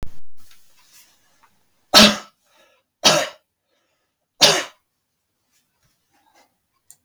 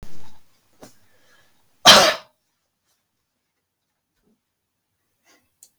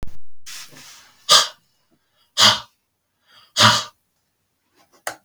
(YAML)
three_cough_length: 7.0 s
three_cough_amplitude: 32768
three_cough_signal_mean_std_ratio: 0.28
cough_length: 5.8 s
cough_amplitude: 32768
cough_signal_mean_std_ratio: 0.23
exhalation_length: 5.2 s
exhalation_amplitude: 32768
exhalation_signal_mean_std_ratio: 0.36
survey_phase: beta (2021-08-13 to 2022-03-07)
age: 45-64
gender: Male
wearing_mask: 'No'
symptom_none: true
smoker_status: Never smoked
respiratory_condition_asthma: false
respiratory_condition_other: false
recruitment_source: REACT
submission_delay: 1 day
covid_test_result: Negative
covid_test_method: RT-qPCR
influenza_a_test_result: Negative
influenza_b_test_result: Negative